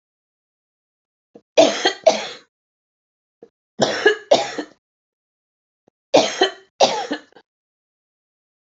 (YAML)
three_cough_length: 8.8 s
three_cough_amplitude: 32767
three_cough_signal_mean_std_ratio: 0.3
survey_phase: alpha (2021-03-01 to 2021-08-12)
age: 45-64
gender: Female
wearing_mask: 'No'
symptom_none: true
smoker_status: Current smoker (1 to 10 cigarettes per day)
respiratory_condition_asthma: false
respiratory_condition_other: false
recruitment_source: REACT
submission_delay: 1 day
covid_test_result: Negative
covid_test_method: RT-qPCR